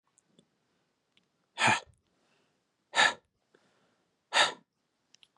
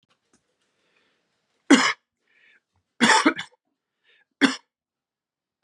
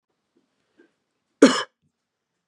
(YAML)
exhalation_length: 5.4 s
exhalation_amplitude: 8953
exhalation_signal_mean_std_ratio: 0.25
three_cough_length: 5.6 s
three_cough_amplitude: 28533
three_cough_signal_mean_std_ratio: 0.26
cough_length: 2.5 s
cough_amplitude: 31785
cough_signal_mean_std_ratio: 0.18
survey_phase: beta (2021-08-13 to 2022-03-07)
age: 18-44
gender: Male
wearing_mask: 'No'
symptom_cough_any: true
smoker_status: Never smoked
respiratory_condition_asthma: false
respiratory_condition_other: false
recruitment_source: REACT
submission_delay: 3 days
covid_test_result: Negative
covid_test_method: RT-qPCR
influenza_a_test_result: Unknown/Void
influenza_b_test_result: Unknown/Void